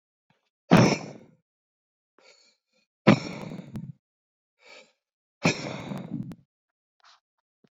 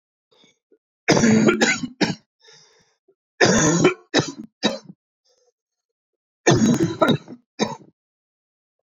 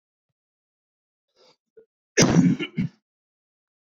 exhalation_length: 7.8 s
exhalation_amplitude: 24613
exhalation_signal_mean_std_ratio: 0.25
three_cough_length: 9.0 s
three_cough_amplitude: 26159
three_cough_signal_mean_std_ratio: 0.42
cough_length: 3.8 s
cough_amplitude: 22098
cough_signal_mean_std_ratio: 0.29
survey_phase: beta (2021-08-13 to 2022-03-07)
age: 18-44
gender: Male
wearing_mask: 'No'
symptom_cough_any: true
symptom_runny_or_blocked_nose: true
symptom_shortness_of_breath: true
symptom_fatigue: true
symptom_headache: true
symptom_onset: 3 days
smoker_status: Never smoked
respiratory_condition_asthma: false
respiratory_condition_other: false
recruitment_source: Test and Trace
submission_delay: 2 days
covid_test_result: Positive
covid_test_method: RT-qPCR
covid_ct_value: 21.4
covid_ct_gene: ORF1ab gene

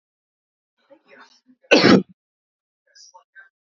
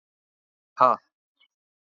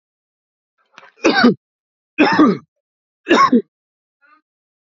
cough_length: 3.7 s
cough_amplitude: 28150
cough_signal_mean_std_ratio: 0.23
exhalation_length: 1.9 s
exhalation_amplitude: 23781
exhalation_signal_mean_std_ratio: 0.2
three_cough_length: 4.9 s
three_cough_amplitude: 32768
three_cough_signal_mean_std_ratio: 0.37
survey_phase: alpha (2021-03-01 to 2021-08-12)
age: 18-44
gender: Male
wearing_mask: 'No'
symptom_none: true
smoker_status: Never smoked
respiratory_condition_asthma: false
respiratory_condition_other: false
recruitment_source: REACT
submission_delay: 1 day
covid_test_result: Negative
covid_test_method: RT-qPCR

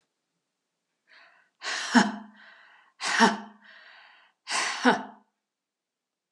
exhalation_length: 6.3 s
exhalation_amplitude: 19727
exhalation_signal_mean_std_ratio: 0.33
survey_phase: alpha (2021-03-01 to 2021-08-12)
age: 65+
gender: Female
wearing_mask: 'No'
symptom_cough_any: true
symptom_headache: true
symptom_onset: 3 days
smoker_status: Never smoked
respiratory_condition_asthma: false
respiratory_condition_other: false
recruitment_source: Test and Trace
submission_delay: 1 day
covid_test_result: Positive
covid_test_method: RT-qPCR
covid_ct_value: 21.1
covid_ct_gene: ORF1ab gene
covid_ct_mean: 22.1
covid_viral_load: 54000 copies/ml
covid_viral_load_category: Low viral load (10K-1M copies/ml)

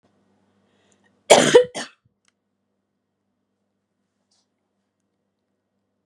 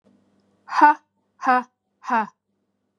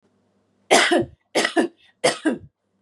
cough_length: 6.1 s
cough_amplitude: 32768
cough_signal_mean_std_ratio: 0.18
exhalation_length: 3.0 s
exhalation_amplitude: 28582
exhalation_signal_mean_std_ratio: 0.33
three_cough_length: 2.8 s
three_cough_amplitude: 26854
three_cough_signal_mean_std_ratio: 0.44
survey_phase: beta (2021-08-13 to 2022-03-07)
age: 45-64
gender: Female
wearing_mask: 'No'
symptom_sore_throat: true
symptom_abdominal_pain: true
symptom_diarrhoea: true
symptom_fatigue: true
symptom_headache: true
symptom_onset: 2 days
smoker_status: Never smoked
respiratory_condition_asthma: true
respiratory_condition_other: false
recruitment_source: Test and Trace
submission_delay: 1 day
covid_test_result: Negative
covid_test_method: RT-qPCR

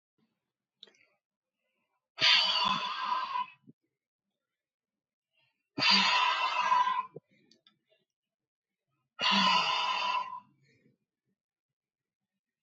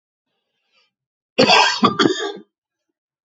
exhalation_length: 12.6 s
exhalation_amplitude: 9638
exhalation_signal_mean_std_ratio: 0.43
cough_length: 3.2 s
cough_amplitude: 29085
cough_signal_mean_std_ratio: 0.38
survey_phase: beta (2021-08-13 to 2022-03-07)
age: 45-64
gender: Male
wearing_mask: 'No'
symptom_none: true
smoker_status: Ex-smoker
respiratory_condition_asthma: false
respiratory_condition_other: false
recruitment_source: REACT
submission_delay: 1 day
covid_test_result: Negative
covid_test_method: RT-qPCR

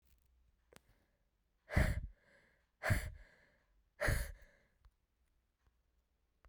exhalation_length: 6.5 s
exhalation_amplitude: 3702
exhalation_signal_mean_std_ratio: 0.29
survey_phase: beta (2021-08-13 to 2022-03-07)
age: 18-44
gender: Female
wearing_mask: 'No'
symptom_cough_any: true
symptom_new_continuous_cough: true
symptom_runny_or_blocked_nose: true
symptom_shortness_of_breath: true
symptom_sore_throat: true
symptom_abdominal_pain: true
symptom_diarrhoea: true
symptom_fever_high_temperature: true
symptom_headache: true
symptom_change_to_sense_of_smell_or_taste: true
symptom_loss_of_taste: true
symptom_onset: 3 days
smoker_status: Never smoked
respiratory_condition_asthma: false
respiratory_condition_other: false
recruitment_source: Test and Trace
submission_delay: 2 days
covid_test_result: Positive
covid_test_method: RT-qPCR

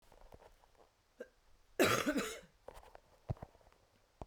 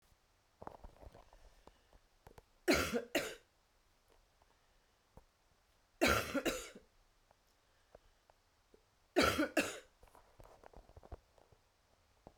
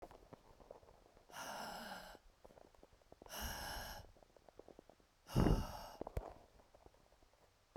cough_length: 4.3 s
cough_amplitude: 4099
cough_signal_mean_std_ratio: 0.32
three_cough_length: 12.4 s
three_cough_amplitude: 4472
three_cough_signal_mean_std_ratio: 0.3
exhalation_length: 7.8 s
exhalation_amplitude: 3286
exhalation_signal_mean_std_ratio: 0.36
survey_phase: beta (2021-08-13 to 2022-03-07)
age: 45-64
gender: Female
wearing_mask: 'No'
symptom_new_continuous_cough: true
symptom_runny_or_blocked_nose: true
symptom_sore_throat: true
symptom_abdominal_pain: true
symptom_diarrhoea: true
symptom_fatigue: true
symptom_fever_high_temperature: true
symptom_change_to_sense_of_smell_or_taste: true
symptom_onset: 10 days
smoker_status: Ex-smoker
respiratory_condition_asthma: false
respiratory_condition_other: false
recruitment_source: Test and Trace
submission_delay: 1 day
covid_test_result: Positive
covid_test_method: RT-qPCR
covid_ct_value: 26.6
covid_ct_gene: ORF1ab gene
covid_ct_mean: 27.1
covid_viral_load: 1300 copies/ml
covid_viral_load_category: Minimal viral load (< 10K copies/ml)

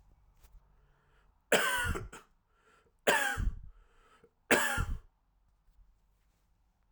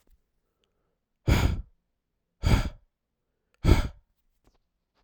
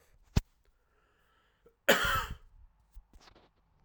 three_cough_length: 6.9 s
three_cough_amplitude: 9876
three_cough_signal_mean_std_ratio: 0.37
exhalation_length: 5.0 s
exhalation_amplitude: 15271
exhalation_signal_mean_std_ratio: 0.3
cough_length: 3.8 s
cough_amplitude: 12360
cough_signal_mean_std_ratio: 0.26
survey_phase: alpha (2021-03-01 to 2021-08-12)
age: 18-44
gender: Male
wearing_mask: 'No'
symptom_cough_any: true
symptom_new_continuous_cough: true
symptom_change_to_sense_of_smell_or_taste: true
symptom_loss_of_taste: true
smoker_status: Never smoked
respiratory_condition_asthma: false
respiratory_condition_other: false
recruitment_source: Test and Trace
submission_delay: 2 days
covid_test_result: Positive
covid_test_method: LFT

